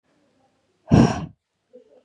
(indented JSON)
{
  "exhalation_length": "2.0 s",
  "exhalation_amplitude": 28206,
  "exhalation_signal_mean_std_ratio": 0.28,
  "survey_phase": "beta (2021-08-13 to 2022-03-07)",
  "age": "18-44",
  "gender": "Female",
  "wearing_mask": "No",
  "symptom_change_to_sense_of_smell_or_taste": true,
  "smoker_status": "Never smoked",
  "respiratory_condition_asthma": false,
  "respiratory_condition_other": false,
  "recruitment_source": "REACT",
  "submission_delay": "1 day",
  "covid_test_result": "Negative",
  "covid_test_method": "RT-qPCR",
  "influenza_a_test_result": "Negative",
  "influenza_b_test_result": "Negative"
}